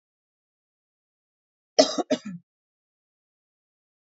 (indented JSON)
{
  "cough_length": "4.1 s",
  "cough_amplitude": 24297,
  "cough_signal_mean_std_ratio": 0.18,
  "survey_phase": "beta (2021-08-13 to 2022-03-07)",
  "age": "18-44",
  "gender": "Female",
  "wearing_mask": "No",
  "symptom_cough_any": true,
  "symptom_runny_or_blocked_nose": true,
  "symptom_fatigue": true,
  "symptom_headache": true,
  "symptom_onset": "5 days",
  "smoker_status": "Never smoked",
  "respiratory_condition_asthma": false,
  "respiratory_condition_other": false,
  "recruitment_source": "Test and Trace",
  "submission_delay": "1 day",
  "covid_test_result": "Positive",
  "covid_test_method": "ePCR"
}